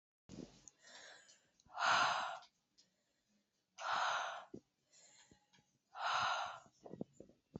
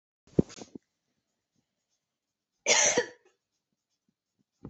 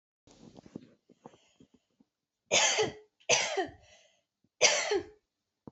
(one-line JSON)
{"exhalation_length": "7.6 s", "exhalation_amplitude": 2814, "exhalation_signal_mean_std_ratio": 0.42, "cough_length": "4.7 s", "cough_amplitude": 14653, "cough_signal_mean_std_ratio": 0.23, "three_cough_length": "5.7 s", "three_cough_amplitude": 13005, "three_cough_signal_mean_std_ratio": 0.36, "survey_phase": "beta (2021-08-13 to 2022-03-07)", "age": "18-44", "gender": "Female", "wearing_mask": "No", "symptom_cough_any": true, "symptom_runny_or_blocked_nose": true, "symptom_shortness_of_breath": true, "symptom_sore_throat": true, "symptom_fatigue": true, "symptom_onset": "3 days", "smoker_status": "Never smoked", "respiratory_condition_asthma": true, "respiratory_condition_other": false, "recruitment_source": "Test and Trace", "submission_delay": "2 days", "covid_test_result": "Positive", "covid_test_method": "RT-qPCR", "covid_ct_value": 20.0, "covid_ct_gene": "N gene"}